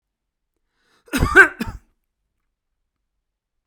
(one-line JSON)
{"cough_length": "3.7 s", "cough_amplitude": 32768, "cough_signal_mean_std_ratio": 0.22, "survey_phase": "beta (2021-08-13 to 2022-03-07)", "age": "65+", "gender": "Male", "wearing_mask": "No", "symptom_none": true, "smoker_status": "Ex-smoker", "respiratory_condition_asthma": false, "respiratory_condition_other": false, "recruitment_source": "REACT", "submission_delay": "1 day", "covid_test_result": "Negative", "covid_test_method": "RT-qPCR"}